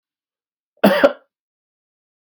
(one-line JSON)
{"cough_length": "2.2 s", "cough_amplitude": 32768, "cough_signal_mean_std_ratio": 0.26, "survey_phase": "beta (2021-08-13 to 2022-03-07)", "age": "45-64", "gender": "Male", "wearing_mask": "No", "symptom_none": true, "symptom_onset": "12 days", "smoker_status": "Current smoker (11 or more cigarettes per day)", "respiratory_condition_asthma": false, "respiratory_condition_other": false, "recruitment_source": "REACT", "submission_delay": "2 days", "covid_test_result": "Negative", "covid_test_method": "RT-qPCR", "influenza_a_test_result": "Negative", "influenza_b_test_result": "Negative"}